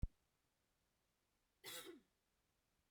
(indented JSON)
{
  "cough_length": "2.9 s",
  "cough_amplitude": 1212,
  "cough_signal_mean_std_ratio": 0.22,
  "survey_phase": "beta (2021-08-13 to 2022-03-07)",
  "age": "18-44",
  "gender": "Female",
  "wearing_mask": "No",
  "symptom_none": true,
  "symptom_onset": "2 days",
  "smoker_status": "Current smoker (e-cigarettes or vapes only)",
  "respiratory_condition_asthma": false,
  "respiratory_condition_other": false,
  "recruitment_source": "REACT",
  "submission_delay": "2 days",
  "covid_test_result": "Negative",
  "covid_test_method": "RT-qPCR",
  "influenza_a_test_result": "Negative",
  "influenza_b_test_result": "Negative"
}